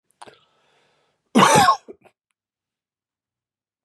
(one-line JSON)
{"cough_length": "3.8 s", "cough_amplitude": 27107, "cough_signal_mean_std_ratio": 0.27, "survey_phase": "beta (2021-08-13 to 2022-03-07)", "age": "45-64", "gender": "Male", "wearing_mask": "No", "symptom_cough_any": true, "symptom_new_continuous_cough": true, "smoker_status": "Ex-smoker", "respiratory_condition_asthma": true, "respiratory_condition_other": false, "recruitment_source": "REACT", "submission_delay": "2 days", "covid_test_result": "Negative", "covid_test_method": "RT-qPCR", "influenza_a_test_result": "Unknown/Void", "influenza_b_test_result": "Unknown/Void"}